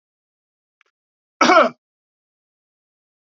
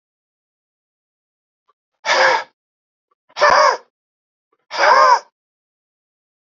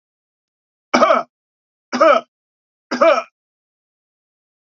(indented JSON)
{
  "cough_length": "3.3 s",
  "cough_amplitude": 27979,
  "cough_signal_mean_std_ratio": 0.23,
  "exhalation_length": "6.5 s",
  "exhalation_amplitude": 28538,
  "exhalation_signal_mean_std_ratio": 0.34,
  "three_cough_length": "4.8 s",
  "three_cough_amplitude": 32767,
  "three_cough_signal_mean_std_ratio": 0.32,
  "survey_phase": "beta (2021-08-13 to 2022-03-07)",
  "age": "45-64",
  "gender": "Male",
  "wearing_mask": "No",
  "symptom_cough_any": true,
  "symptom_runny_or_blocked_nose": true,
  "smoker_status": "Never smoked",
  "respiratory_condition_asthma": false,
  "respiratory_condition_other": false,
  "recruitment_source": "Test and Trace",
  "submission_delay": "2 days",
  "covid_test_result": "Positive",
  "covid_test_method": "RT-qPCR",
  "covid_ct_value": 14.9,
  "covid_ct_gene": "ORF1ab gene",
  "covid_ct_mean": 16.2,
  "covid_viral_load": "5000000 copies/ml",
  "covid_viral_load_category": "High viral load (>1M copies/ml)"
}